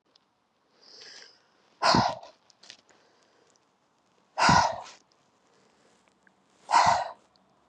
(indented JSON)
{
  "exhalation_length": "7.7 s",
  "exhalation_amplitude": 15113,
  "exhalation_signal_mean_std_ratio": 0.31,
  "survey_phase": "beta (2021-08-13 to 2022-03-07)",
  "age": "18-44",
  "gender": "Female",
  "wearing_mask": "No",
  "symptom_none": true,
  "symptom_onset": "13 days",
  "smoker_status": "Never smoked",
  "respiratory_condition_asthma": false,
  "respiratory_condition_other": false,
  "recruitment_source": "REACT",
  "submission_delay": "1 day",
  "covid_test_result": "Negative",
  "covid_test_method": "RT-qPCR",
  "influenza_a_test_result": "Negative",
  "influenza_b_test_result": "Negative"
}